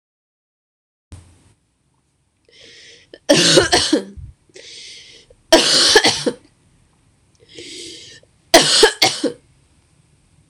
{"three_cough_length": "10.5 s", "three_cough_amplitude": 26028, "three_cough_signal_mean_std_ratio": 0.36, "survey_phase": "beta (2021-08-13 to 2022-03-07)", "age": "18-44", "gender": "Female", "wearing_mask": "No", "symptom_cough_any": true, "symptom_runny_or_blocked_nose": true, "symptom_sore_throat": true, "symptom_fatigue": true, "symptom_headache": true, "symptom_other": true, "smoker_status": "Ex-smoker", "respiratory_condition_asthma": false, "respiratory_condition_other": false, "recruitment_source": "Test and Trace", "submission_delay": "2 days", "covid_test_result": "Positive", "covid_test_method": "RT-qPCR", "covid_ct_value": 32.7, "covid_ct_gene": "ORF1ab gene"}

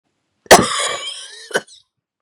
{"cough_length": "2.2 s", "cough_amplitude": 32768, "cough_signal_mean_std_ratio": 0.33, "survey_phase": "beta (2021-08-13 to 2022-03-07)", "age": "18-44", "gender": "Female", "wearing_mask": "No", "symptom_cough_any": true, "symptom_runny_or_blocked_nose": true, "symptom_shortness_of_breath": true, "symptom_sore_throat": true, "symptom_abdominal_pain": true, "symptom_diarrhoea": true, "symptom_fatigue": true, "symptom_fever_high_temperature": true, "symptom_headache": true, "symptom_change_to_sense_of_smell_or_taste": true, "symptom_onset": "4 days", "smoker_status": "Ex-smoker", "respiratory_condition_asthma": false, "respiratory_condition_other": false, "recruitment_source": "Test and Trace", "submission_delay": "2 days", "covid_test_result": "Positive", "covid_test_method": "RT-qPCR", "covid_ct_value": 21.4, "covid_ct_gene": "ORF1ab gene", "covid_ct_mean": 21.7, "covid_viral_load": "77000 copies/ml", "covid_viral_load_category": "Low viral load (10K-1M copies/ml)"}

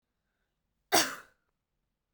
{"cough_length": "2.1 s", "cough_amplitude": 9483, "cough_signal_mean_std_ratio": 0.22, "survey_phase": "beta (2021-08-13 to 2022-03-07)", "age": "18-44", "gender": "Female", "wearing_mask": "No", "symptom_runny_or_blocked_nose": true, "symptom_sore_throat": true, "symptom_headache": true, "smoker_status": "Never smoked", "respiratory_condition_asthma": false, "respiratory_condition_other": false, "recruitment_source": "Test and Trace", "submission_delay": "2 days", "covid_test_result": "Positive", "covid_test_method": "RT-qPCR", "covid_ct_value": 31.7, "covid_ct_gene": "ORF1ab gene"}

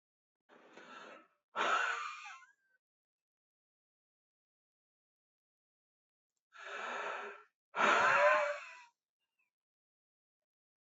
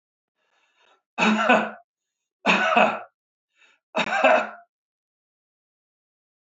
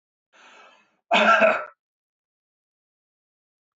{"exhalation_length": "10.9 s", "exhalation_amplitude": 4858, "exhalation_signal_mean_std_ratio": 0.33, "three_cough_length": "6.5 s", "three_cough_amplitude": 21335, "three_cough_signal_mean_std_ratio": 0.38, "cough_length": "3.8 s", "cough_amplitude": 17674, "cough_signal_mean_std_ratio": 0.3, "survey_phase": "beta (2021-08-13 to 2022-03-07)", "age": "65+", "gender": "Male", "wearing_mask": "No", "symptom_cough_any": true, "smoker_status": "Ex-smoker", "respiratory_condition_asthma": false, "respiratory_condition_other": true, "recruitment_source": "REACT", "submission_delay": "1 day", "covid_test_result": "Negative", "covid_test_method": "RT-qPCR", "influenza_a_test_result": "Negative", "influenza_b_test_result": "Negative"}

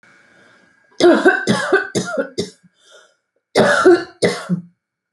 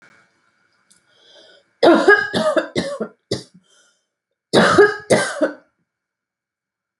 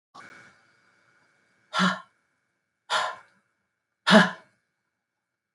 {"cough_length": "5.1 s", "cough_amplitude": 29294, "cough_signal_mean_std_ratio": 0.48, "three_cough_length": "7.0 s", "three_cough_amplitude": 28685, "three_cough_signal_mean_std_ratio": 0.38, "exhalation_length": "5.5 s", "exhalation_amplitude": 24947, "exhalation_signal_mean_std_ratio": 0.25, "survey_phase": "alpha (2021-03-01 to 2021-08-12)", "age": "45-64", "gender": "Female", "wearing_mask": "No", "symptom_none": true, "smoker_status": "Ex-smoker", "respiratory_condition_asthma": false, "respiratory_condition_other": false, "recruitment_source": "REACT", "submission_delay": "1 day", "covid_test_result": "Negative", "covid_test_method": "RT-qPCR"}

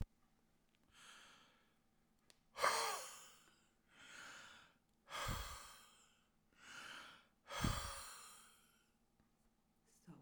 {"exhalation_length": "10.2 s", "exhalation_amplitude": 3494, "exhalation_signal_mean_std_ratio": 0.38, "survey_phase": "alpha (2021-03-01 to 2021-08-12)", "age": "65+", "gender": "Male", "wearing_mask": "No", "symptom_none": true, "smoker_status": "Never smoked", "respiratory_condition_asthma": false, "respiratory_condition_other": false, "recruitment_source": "REACT", "submission_delay": "2 days", "covid_test_result": "Negative", "covid_test_method": "RT-qPCR"}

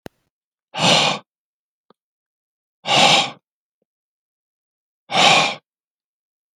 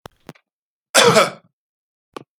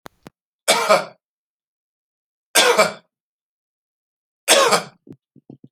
{"exhalation_length": "6.6 s", "exhalation_amplitude": 32097, "exhalation_signal_mean_std_ratio": 0.34, "cough_length": "2.4 s", "cough_amplitude": 32768, "cough_signal_mean_std_ratio": 0.31, "three_cough_length": "5.7 s", "three_cough_amplitude": 32768, "three_cough_signal_mean_std_ratio": 0.33, "survey_phase": "beta (2021-08-13 to 2022-03-07)", "age": "18-44", "gender": "Male", "wearing_mask": "No", "symptom_none": true, "smoker_status": "Never smoked", "respiratory_condition_asthma": false, "respiratory_condition_other": false, "recruitment_source": "REACT", "submission_delay": "1 day", "covid_test_result": "Negative", "covid_test_method": "RT-qPCR"}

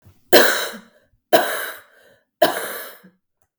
{"three_cough_length": "3.6 s", "three_cough_amplitude": 32768, "three_cough_signal_mean_std_ratio": 0.37, "survey_phase": "beta (2021-08-13 to 2022-03-07)", "age": "45-64", "gender": "Female", "wearing_mask": "No", "symptom_cough_any": true, "symptom_runny_or_blocked_nose": true, "symptom_fatigue": true, "symptom_onset": "4 days", "smoker_status": "Never smoked", "respiratory_condition_asthma": true, "respiratory_condition_other": false, "recruitment_source": "Test and Trace", "submission_delay": "1 day", "covid_test_result": "Negative", "covid_test_method": "RT-qPCR"}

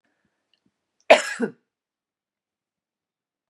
{"cough_length": "3.5 s", "cough_amplitude": 31013, "cough_signal_mean_std_ratio": 0.17, "survey_phase": "beta (2021-08-13 to 2022-03-07)", "age": "65+", "gender": "Female", "wearing_mask": "No", "symptom_none": true, "smoker_status": "Never smoked", "respiratory_condition_asthma": false, "respiratory_condition_other": false, "recruitment_source": "REACT", "submission_delay": "1 day", "covid_test_result": "Negative", "covid_test_method": "RT-qPCR", "influenza_a_test_result": "Negative", "influenza_b_test_result": "Negative"}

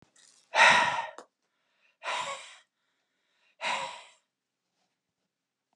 {"exhalation_length": "5.8 s", "exhalation_amplitude": 15988, "exhalation_signal_mean_std_ratio": 0.3, "survey_phase": "alpha (2021-03-01 to 2021-08-12)", "age": "18-44", "gender": "Male", "wearing_mask": "No", "symptom_none": true, "smoker_status": "Never smoked", "respiratory_condition_asthma": false, "respiratory_condition_other": false, "recruitment_source": "REACT", "submission_delay": "1 day", "covid_test_result": "Negative", "covid_test_method": "RT-qPCR"}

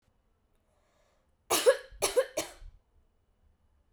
{"three_cough_length": "3.9 s", "three_cough_amplitude": 10530, "three_cough_signal_mean_std_ratio": 0.28, "survey_phase": "beta (2021-08-13 to 2022-03-07)", "age": "18-44", "gender": "Female", "wearing_mask": "No", "symptom_none": true, "symptom_onset": "7 days", "smoker_status": "Current smoker (e-cigarettes or vapes only)", "respiratory_condition_asthma": false, "respiratory_condition_other": false, "recruitment_source": "REACT", "submission_delay": "1 day", "covid_test_result": "Negative", "covid_test_method": "RT-qPCR", "influenza_a_test_result": "Negative", "influenza_b_test_result": "Negative"}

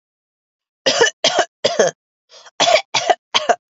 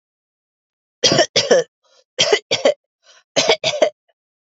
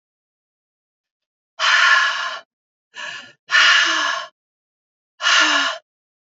{"cough_length": "3.8 s", "cough_amplitude": 32767, "cough_signal_mean_std_ratio": 0.44, "three_cough_length": "4.4 s", "three_cough_amplitude": 30680, "three_cough_signal_mean_std_ratio": 0.41, "exhalation_length": "6.3 s", "exhalation_amplitude": 27706, "exhalation_signal_mean_std_ratio": 0.47, "survey_phase": "beta (2021-08-13 to 2022-03-07)", "age": "18-44", "gender": "Female", "wearing_mask": "Yes", "symptom_none": true, "smoker_status": "Never smoked", "respiratory_condition_asthma": false, "respiratory_condition_other": false, "recruitment_source": "REACT", "submission_delay": "2 days", "covid_test_result": "Negative", "covid_test_method": "RT-qPCR", "influenza_a_test_result": "Negative", "influenza_b_test_result": "Negative"}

